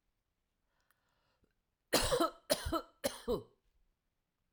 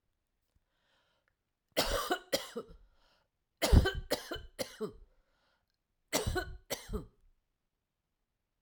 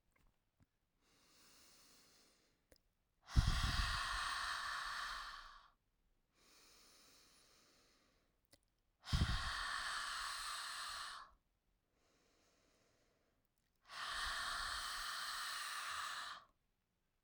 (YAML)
three_cough_length: 4.5 s
three_cough_amplitude: 4927
three_cough_signal_mean_std_ratio: 0.34
cough_length: 8.6 s
cough_amplitude: 10451
cough_signal_mean_std_ratio: 0.31
exhalation_length: 17.2 s
exhalation_amplitude: 3819
exhalation_signal_mean_std_ratio: 0.49
survey_phase: alpha (2021-03-01 to 2021-08-12)
age: 18-44
gender: Female
wearing_mask: 'No'
symptom_none: true
smoker_status: Never smoked
respiratory_condition_asthma: false
respiratory_condition_other: false
recruitment_source: REACT
submission_delay: 2 days
covid_test_result: Negative
covid_test_method: RT-qPCR